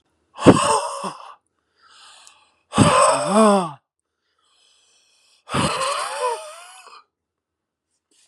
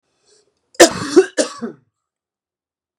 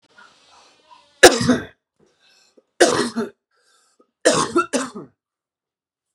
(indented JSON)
{
  "exhalation_length": "8.3 s",
  "exhalation_amplitude": 32768,
  "exhalation_signal_mean_std_ratio": 0.39,
  "cough_length": "3.0 s",
  "cough_amplitude": 32768,
  "cough_signal_mean_std_ratio": 0.27,
  "three_cough_length": "6.1 s",
  "three_cough_amplitude": 32768,
  "three_cough_signal_mean_std_ratio": 0.3,
  "survey_phase": "beta (2021-08-13 to 2022-03-07)",
  "age": "18-44",
  "gender": "Male",
  "wearing_mask": "No",
  "symptom_sore_throat": true,
  "symptom_fatigue": true,
  "symptom_onset": "6 days",
  "smoker_status": "Never smoked",
  "respiratory_condition_asthma": false,
  "respiratory_condition_other": false,
  "recruitment_source": "Test and Trace",
  "submission_delay": "1 day",
  "covid_test_result": "Positive",
  "covid_test_method": "ePCR"
}